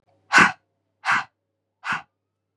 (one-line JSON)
{"exhalation_length": "2.6 s", "exhalation_amplitude": 26926, "exhalation_signal_mean_std_ratio": 0.3, "survey_phase": "beta (2021-08-13 to 2022-03-07)", "age": "18-44", "gender": "Female", "wearing_mask": "No", "symptom_cough_any": true, "symptom_runny_or_blocked_nose": true, "symptom_onset": "7 days", "smoker_status": "Current smoker (1 to 10 cigarettes per day)", "respiratory_condition_asthma": false, "respiratory_condition_other": false, "recruitment_source": "REACT", "submission_delay": "2 days", "covid_test_result": "Negative", "covid_test_method": "RT-qPCR", "covid_ct_value": 47.0, "covid_ct_gene": "N gene"}